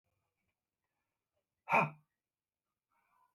{"exhalation_length": "3.3 s", "exhalation_amplitude": 4294, "exhalation_signal_mean_std_ratio": 0.19, "survey_phase": "beta (2021-08-13 to 2022-03-07)", "age": "45-64", "gender": "Male", "wearing_mask": "No", "symptom_none": true, "smoker_status": "Current smoker (e-cigarettes or vapes only)", "respiratory_condition_asthma": false, "respiratory_condition_other": false, "recruitment_source": "REACT", "submission_delay": "10 days", "covid_test_result": "Negative", "covid_test_method": "RT-qPCR", "influenza_a_test_result": "Unknown/Void", "influenza_b_test_result": "Unknown/Void"}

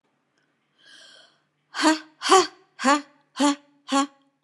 {"exhalation_length": "4.4 s", "exhalation_amplitude": 24116, "exhalation_signal_mean_std_ratio": 0.36, "survey_phase": "beta (2021-08-13 to 2022-03-07)", "age": "65+", "gender": "Female", "wearing_mask": "No", "symptom_none": true, "smoker_status": "Never smoked", "respiratory_condition_asthma": false, "respiratory_condition_other": false, "recruitment_source": "REACT", "submission_delay": "1 day", "covid_test_result": "Negative", "covid_test_method": "RT-qPCR", "influenza_a_test_result": "Negative", "influenza_b_test_result": "Negative"}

